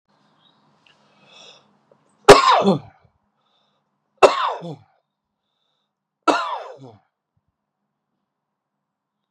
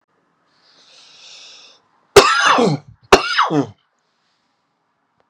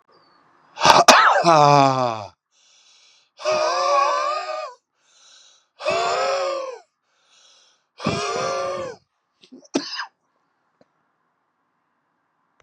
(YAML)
three_cough_length: 9.3 s
three_cough_amplitude: 32768
three_cough_signal_mean_std_ratio: 0.23
cough_length: 5.3 s
cough_amplitude: 32768
cough_signal_mean_std_ratio: 0.34
exhalation_length: 12.6 s
exhalation_amplitude: 32768
exhalation_signal_mean_std_ratio: 0.42
survey_phase: beta (2021-08-13 to 2022-03-07)
age: 45-64
gender: Male
wearing_mask: 'No'
symptom_cough_any: true
symptom_runny_or_blocked_nose: true
symptom_headache: true
symptom_change_to_sense_of_smell_or_taste: true
symptom_onset: 5 days
smoker_status: Never smoked
respiratory_condition_asthma: false
respiratory_condition_other: false
recruitment_source: Test and Trace
submission_delay: 2 days
covid_test_result: Positive
covid_test_method: RT-qPCR
covid_ct_value: 12.3
covid_ct_gene: ORF1ab gene